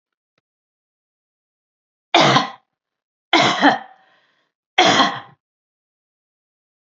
three_cough_length: 7.0 s
three_cough_amplitude: 32768
three_cough_signal_mean_std_ratio: 0.32
survey_phase: beta (2021-08-13 to 2022-03-07)
age: 65+
gender: Female
wearing_mask: 'No'
symptom_runny_or_blocked_nose: true
symptom_sore_throat: true
symptom_onset: 10 days
smoker_status: Never smoked
respiratory_condition_asthma: false
respiratory_condition_other: false
recruitment_source: REACT
submission_delay: 1 day
covid_test_result: Negative
covid_test_method: RT-qPCR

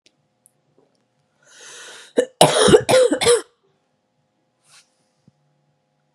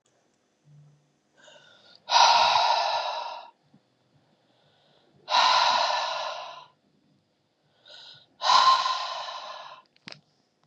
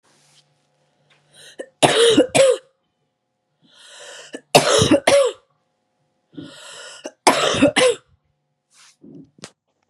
cough_length: 6.1 s
cough_amplitude: 32768
cough_signal_mean_std_ratio: 0.31
exhalation_length: 10.7 s
exhalation_amplitude: 17146
exhalation_signal_mean_std_ratio: 0.44
three_cough_length: 9.9 s
three_cough_amplitude: 32768
three_cough_signal_mean_std_ratio: 0.38
survey_phase: beta (2021-08-13 to 2022-03-07)
age: 18-44
gender: Female
wearing_mask: 'No'
symptom_cough_any: true
symptom_runny_or_blocked_nose: true
symptom_sore_throat: true
symptom_fatigue: true
symptom_headache: true
symptom_onset: 3 days
smoker_status: Never smoked
respiratory_condition_asthma: false
respiratory_condition_other: false
recruitment_source: Test and Trace
submission_delay: 2 days
covid_test_result: Positive
covid_test_method: RT-qPCR
covid_ct_value: 17.5
covid_ct_gene: ORF1ab gene
covid_ct_mean: 18.0
covid_viral_load: 1200000 copies/ml
covid_viral_load_category: High viral load (>1M copies/ml)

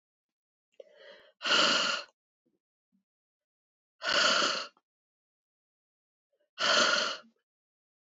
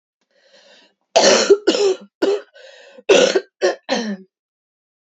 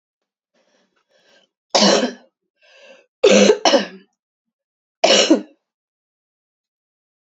exhalation_length: 8.2 s
exhalation_amplitude: 9364
exhalation_signal_mean_std_ratio: 0.38
cough_length: 5.1 s
cough_amplitude: 29571
cough_signal_mean_std_ratio: 0.44
three_cough_length: 7.3 s
three_cough_amplitude: 30419
three_cough_signal_mean_std_ratio: 0.33
survey_phase: beta (2021-08-13 to 2022-03-07)
age: 45-64
gender: Female
wearing_mask: 'No'
symptom_cough_any: true
symptom_runny_or_blocked_nose: true
symptom_sore_throat: true
symptom_onset: 2 days
smoker_status: Never smoked
respiratory_condition_asthma: false
respiratory_condition_other: false
recruitment_source: Test and Trace
submission_delay: 1 day
covid_test_result: Positive
covid_test_method: RT-qPCR
covid_ct_value: 23.7
covid_ct_gene: ORF1ab gene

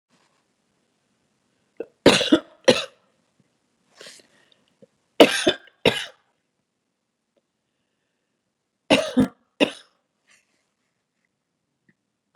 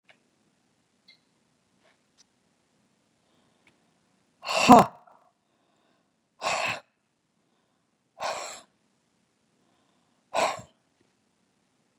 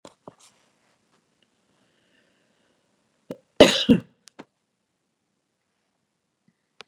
three_cough_length: 12.4 s
three_cough_amplitude: 32768
three_cough_signal_mean_std_ratio: 0.21
exhalation_length: 12.0 s
exhalation_amplitude: 31520
exhalation_signal_mean_std_ratio: 0.18
cough_length: 6.9 s
cough_amplitude: 32768
cough_signal_mean_std_ratio: 0.15
survey_phase: beta (2021-08-13 to 2022-03-07)
age: 65+
gender: Female
wearing_mask: 'No'
symptom_shortness_of_breath: true
smoker_status: Ex-smoker
respiratory_condition_asthma: false
respiratory_condition_other: false
recruitment_source: REACT
submission_delay: 2 days
covid_test_result: Negative
covid_test_method: RT-qPCR
influenza_a_test_result: Negative
influenza_b_test_result: Negative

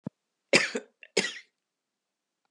cough_length: 2.5 s
cough_amplitude: 18101
cough_signal_mean_std_ratio: 0.26
survey_phase: beta (2021-08-13 to 2022-03-07)
age: 65+
gender: Female
wearing_mask: 'No'
symptom_none: true
smoker_status: Never smoked
respiratory_condition_asthma: false
respiratory_condition_other: false
recruitment_source: REACT
submission_delay: 1 day
covid_test_result: Negative
covid_test_method: RT-qPCR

